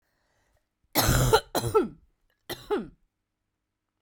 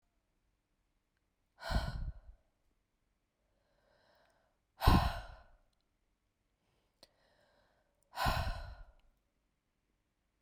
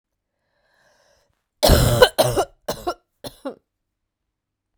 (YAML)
three_cough_length: 4.0 s
three_cough_amplitude: 16101
three_cough_signal_mean_std_ratio: 0.38
exhalation_length: 10.4 s
exhalation_amplitude: 8594
exhalation_signal_mean_std_ratio: 0.25
cough_length: 4.8 s
cough_amplitude: 32768
cough_signal_mean_std_ratio: 0.32
survey_phase: beta (2021-08-13 to 2022-03-07)
age: 45-64
gender: Female
wearing_mask: 'No'
symptom_cough_any: true
symptom_fatigue: true
symptom_headache: true
symptom_change_to_sense_of_smell_or_taste: true
symptom_loss_of_taste: true
symptom_other: true
symptom_onset: 4 days
smoker_status: Ex-smoker
respiratory_condition_asthma: false
respiratory_condition_other: false
recruitment_source: Test and Trace
submission_delay: 2 days
covid_test_result: Positive
covid_test_method: RT-qPCR